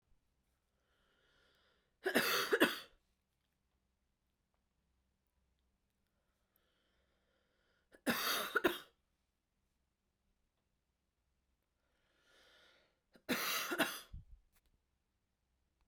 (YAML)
three_cough_length: 15.9 s
three_cough_amplitude: 5305
three_cough_signal_mean_std_ratio: 0.27
survey_phase: beta (2021-08-13 to 2022-03-07)
age: 45-64
gender: Female
wearing_mask: 'No'
symptom_cough_any: true
symptom_sore_throat: true
smoker_status: Never smoked
respiratory_condition_asthma: false
respiratory_condition_other: false
recruitment_source: Test and Trace
submission_delay: 1 day
covid_test_result: Positive
covid_test_method: RT-qPCR
covid_ct_value: 24.3
covid_ct_gene: ORF1ab gene